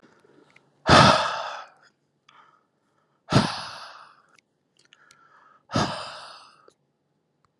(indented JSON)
{
  "exhalation_length": "7.6 s",
  "exhalation_amplitude": 27416,
  "exhalation_signal_mean_std_ratio": 0.28,
  "survey_phase": "alpha (2021-03-01 to 2021-08-12)",
  "age": "18-44",
  "gender": "Male",
  "wearing_mask": "No",
  "symptom_cough_any": true,
  "symptom_change_to_sense_of_smell_or_taste": true,
  "smoker_status": "Never smoked",
  "respiratory_condition_asthma": false,
  "respiratory_condition_other": false,
  "recruitment_source": "Test and Trace",
  "submission_delay": "2 days",
  "covid_test_result": "Positive",
  "covid_test_method": "RT-qPCR",
  "covid_ct_value": 22.6,
  "covid_ct_gene": "ORF1ab gene"
}